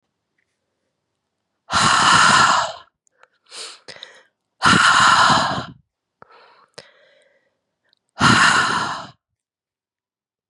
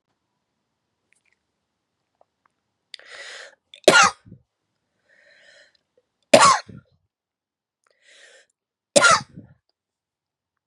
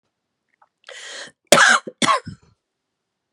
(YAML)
exhalation_length: 10.5 s
exhalation_amplitude: 29229
exhalation_signal_mean_std_ratio: 0.43
three_cough_length: 10.7 s
three_cough_amplitude: 32768
three_cough_signal_mean_std_ratio: 0.21
cough_length: 3.3 s
cough_amplitude: 32768
cough_signal_mean_std_ratio: 0.31
survey_phase: beta (2021-08-13 to 2022-03-07)
age: 45-64
gender: Female
wearing_mask: 'No'
symptom_cough_any: true
symptom_runny_or_blocked_nose: true
symptom_sore_throat: true
symptom_diarrhoea: true
symptom_headache: true
symptom_change_to_sense_of_smell_or_taste: true
smoker_status: Never smoked
respiratory_condition_asthma: false
respiratory_condition_other: false
recruitment_source: Test and Trace
submission_delay: 2 days
covid_test_result: Positive
covid_test_method: LFT